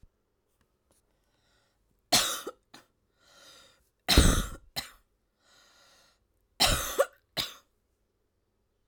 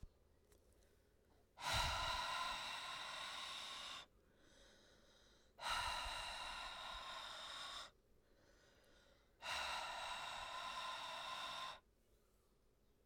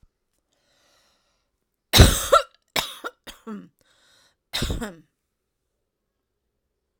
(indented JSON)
{
  "three_cough_length": "8.9 s",
  "three_cough_amplitude": 18079,
  "three_cough_signal_mean_std_ratio": 0.27,
  "exhalation_length": "13.1 s",
  "exhalation_amplitude": 1237,
  "exhalation_signal_mean_std_ratio": 0.68,
  "cough_length": "7.0 s",
  "cough_amplitude": 32768,
  "cough_signal_mean_std_ratio": 0.23,
  "survey_phase": "alpha (2021-03-01 to 2021-08-12)",
  "age": "45-64",
  "gender": "Female",
  "wearing_mask": "No",
  "symptom_none": true,
  "smoker_status": "Ex-smoker",
  "respiratory_condition_asthma": false,
  "respiratory_condition_other": false,
  "recruitment_source": "REACT",
  "submission_delay": "1 day",
  "covid_test_result": "Negative",
  "covid_test_method": "RT-qPCR"
}